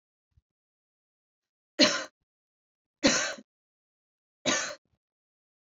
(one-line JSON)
{"three_cough_length": "5.7 s", "three_cough_amplitude": 15154, "three_cough_signal_mean_std_ratio": 0.26, "survey_phase": "beta (2021-08-13 to 2022-03-07)", "age": "18-44", "gender": "Female", "wearing_mask": "No", "symptom_runny_or_blocked_nose": true, "symptom_sore_throat": true, "symptom_fatigue": true, "symptom_onset": "9 days", "smoker_status": "Ex-smoker", "respiratory_condition_asthma": false, "respiratory_condition_other": false, "recruitment_source": "REACT", "submission_delay": "2 days", "covid_test_result": "Negative", "covid_test_method": "RT-qPCR", "influenza_a_test_result": "Negative", "influenza_b_test_result": "Negative"}